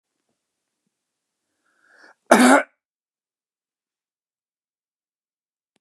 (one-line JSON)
{"cough_length": "5.8 s", "cough_amplitude": 32767, "cough_signal_mean_std_ratio": 0.18, "survey_phase": "beta (2021-08-13 to 2022-03-07)", "age": "65+", "gender": "Male", "wearing_mask": "No", "symptom_none": true, "symptom_onset": "12 days", "smoker_status": "Never smoked", "respiratory_condition_asthma": false, "respiratory_condition_other": false, "recruitment_source": "REACT", "submission_delay": "2 days", "covid_test_result": "Negative", "covid_test_method": "RT-qPCR", "influenza_a_test_result": "Negative", "influenza_b_test_result": "Negative"}